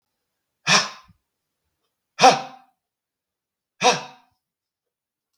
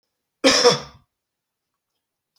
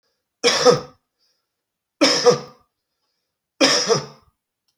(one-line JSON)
{"exhalation_length": "5.4 s", "exhalation_amplitude": 32768, "exhalation_signal_mean_std_ratio": 0.24, "cough_length": "2.4 s", "cough_amplitude": 31948, "cough_signal_mean_std_ratio": 0.29, "three_cough_length": "4.8 s", "three_cough_amplitude": 30920, "three_cough_signal_mean_std_ratio": 0.38, "survey_phase": "beta (2021-08-13 to 2022-03-07)", "age": "45-64", "gender": "Male", "wearing_mask": "No", "symptom_cough_any": true, "symptom_new_continuous_cough": true, "symptom_runny_or_blocked_nose": true, "symptom_onset": "8 days", "smoker_status": "Ex-smoker", "respiratory_condition_asthma": false, "respiratory_condition_other": false, "recruitment_source": "REACT", "submission_delay": "2 days", "covid_test_result": "Negative", "covid_test_method": "RT-qPCR", "influenza_a_test_result": "Negative", "influenza_b_test_result": "Negative"}